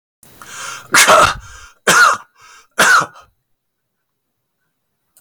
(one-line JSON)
{"three_cough_length": "5.2 s", "three_cough_amplitude": 32768, "three_cough_signal_mean_std_ratio": 0.4, "survey_phase": "beta (2021-08-13 to 2022-03-07)", "age": "45-64", "gender": "Male", "wearing_mask": "No", "symptom_none": true, "smoker_status": "Ex-smoker", "respiratory_condition_asthma": false, "respiratory_condition_other": false, "recruitment_source": "REACT", "submission_delay": "1 day", "covid_test_result": "Negative", "covid_test_method": "RT-qPCR", "influenza_a_test_result": "Negative", "influenza_b_test_result": "Negative"}